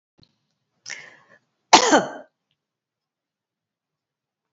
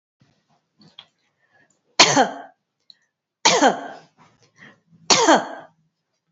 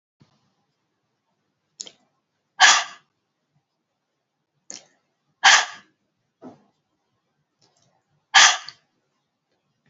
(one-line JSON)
{"cough_length": "4.5 s", "cough_amplitude": 31208, "cough_signal_mean_std_ratio": 0.2, "three_cough_length": "6.3 s", "three_cough_amplitude": 32767, "three_cough_signal_mean_std_ratio": 0.3, "exhalation_length": "9.9 s", "exhalation_amplitude": 30147, "exhalation_signal_mean_std_ratio": 0.2, "survey_phase": "beta (2021-08-13 to 2022-03-07)", "age": "45-64", "gender": "Female", "wearing_mask": "No", "symptom_none": true, "smoker_status": "Never smoked", "respiratory_condition_asthma": false, "respiratory_condition_other": false, "recruitment_source": "REACT", "submission_delay": "4 days", "covid_test_result": "Negative", "covid_test_method": "RT-qPCR", "influenza_a_test_result": "Negative", "influenza_b_test_result": "Negative"}